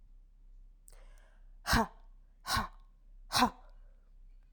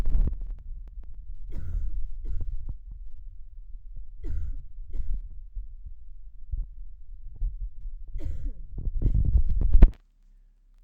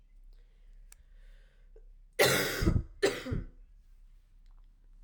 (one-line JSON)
{"exhalation_length": "4.5 s", "exhalation_amplitude": 7675, "exhalation_signal_mean_std_ratio": 0.37, "three_cough_length": "10.8 s", "three_cough_amplitude": 29177, "three_cough_signal_mean_std_ratio": 0.59, "cough_length": "5.0 s", "cough_amplitude": 9408, "cough_signal_mean_std_ratio": 0.41, "survey_phase": "alpha (2021-03-01 to 2021-08-12)", "age": "18-44", "gender": "Female", "wearing_mask": "No", "symptom_cough_any": true, "symptom_headache": true, "symptom_change_to_sense_of_smell_or_taste": true, "symptom_loss_of_taste": true, "smoker_status": "Never smoked", "respiratory_condition_asthma": false, "respiratory_condition_other": false, "recruitment_source": "Test and Trace", "submission_delay": "2 days", "covid_test_result": "Positive", "covid_test_method": "RT-qPCR", "covid_ct_value": 37.2, "covid_ct_gene": "N gene"}